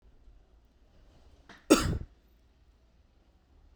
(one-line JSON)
{"cough_length": "3.8 s", "cough_amplitude": 14930, "cough_signal_mean_std_ratio": 0.22, "survey_phase": "beta (2021-08-13 to 2022-03-07)", "age": "18-44", "gender": "Male", "wearing_mask": "No", "symptom_none": true, "smoker_status": "Ex-smoker", "respiratory_condition_asthma": false, "respiratory_condition_other": false, "recruitment_source": "REACT", "submission_delay": "1 day", "covid_test_result": "Negative", "covid_test_method": "RT-qPCR"}